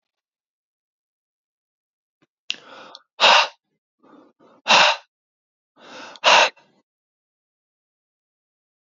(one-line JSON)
{"exhalation_length": "9.0 s", "exhalation_amplitude": 25972, "exhalation_signal_mean_std_ratio": 0.24, "survey_phase": "beta (2021-08-13 to 2022-03-07)", "age": "65+", "gender": "Male", "wearing_mask": "No", "symptom_none": true, "smoker_status": "Ex-smoker", "respiratory_condition_asthma": false, "respiratory_condition_other": false, "recruitment_source": "REACT", "submission_delay": "1 day", "covid_test_result": "Negative", "covid_test_method": "RT-qPCR", "influenza_a_test_result": "Negative", "influenza_b_test_result": "Negative"}